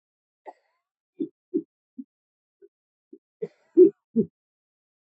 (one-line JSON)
{"cough_length": "5.1 s", "cough_amplitude": 16674, "cough_signal_mean_std_ratio": 0.19, "survey_phase": "alpha (2021-03-01 to 2021-08-12)", "age": "45-64", "gender": "Male", "wearing_mask": "No", "symptom_cough_any": true, "symptom_shortness_of_breath": true, "symptom_fatigue": true, "symptom_headache": true, "smoker_status": "Prefer not to say", "respiratory_condition_asthma": true, "respiratory_condition_other": false, "recruitment_source": "Test and Trace", "submission_delay": "2 days", "covid_test_result": "Positive", "covid_test_method": "RT-qPCR", "covid_ct_value": 11.1, "covid_ct_gene": "ORF1ab gene", "covid_ct_mean": 11.4, "covid_viral_load": "180000000 copies/ml", "covid_viral_load_category": "High viral load (>1M copies/ml)"}